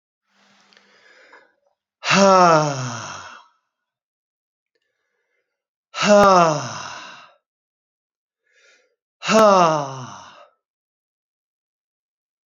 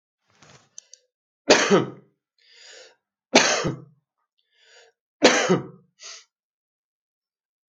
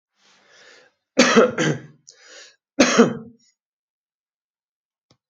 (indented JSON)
{
  "exhalation_length": "12.5 s",
  "exhalation_amplitude": 29968,
  "exhalation_signal_mean_std_ratio": 0.33,
  "three_cough_length": "7.7 s",
  "three_cough_amplitude": 32767,
  "three_cough_signal_mean_std_ratio": 0.29,
  "cough_length": "5.3 s",
  "cough_amplitude": 28272,
  "cough_signal_mean_std_ratio": 0.31,
  "survey_phase": "alpha (2021-03-01 to 2021-08-12)",
  "age": "65+",
  "gender": "Male",
  "wearing_mask": "No",
  "symptom_none": true,
  "smoker_status": "Never smoked",
  "respiratory_condition_asthma": false,
  "respiratory_condition_other": false,
  "recruitment_source": "REACT",
  "submission_delay": "2 days",
  "covid_test_result": "Negative",
  "covid_test_method": "RT-qPCR"
}